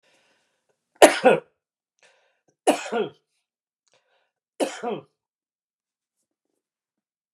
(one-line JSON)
{"three_cough_length": "7.3 s", "three_cough_amplitude": 32768, "three_cough_signal_mean_std_ratio": 0.21, "survey_phase": "beta (2021-08-13 to 2022-03-07)", "age": "65+", "gender": "Male", "wearing_mask": "No", "symptom_headache": true, "smoker_status": "Ex-smoker", "respiratory_condition_asthma": false, "respiratory_condition_other": false, "recruitment_source": "REACT", "submission_delay": "2 days", "covid_test_result": "Negative", "covid_test_method": "RT-qPCR"}